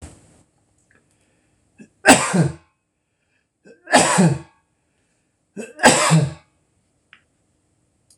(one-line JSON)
{"three_cough_length": "8.2 s", "three_cough_amplitude": 26028, "three_cough_signal_mean_std_ratio": 0.32, "survey_phase": "beta (2021-08-13 to 2022-03-07)", "age": "65+", "gender": "Male", "wearing_mask": "No", "symptom_none": true, "smoker_status": "Ex-smoker", "respiratory_condition_asthma": false, "respiratory_condition_other": false, "recruitment_source": "REACT", "submission_delay": "2 days", "covid_test_result": "Negative", "covid_test_method": "RT-qPCR"}